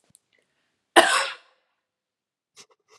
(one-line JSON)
{"cough_length": "3.0 s", "cough_amplitude": 32767, "cough_signal_mean_std_ratio": 0.22, "survey_phase": "alpha (2021-03-01 to 2021-08-12)", "age": "18-44", "gender": "Female", "wearing_mask": "No", "symptom_none": true, "symptom_onset": "12 days", "smoker_status": "Never smoked", "respiratory_condition_asthma": false, "respiratory_condition_other": false, "recruitment_source": "REACT", "submission_delay": "1 day", "covid_test_result": "Negative", "covid_test_method": "RT-qPCR"}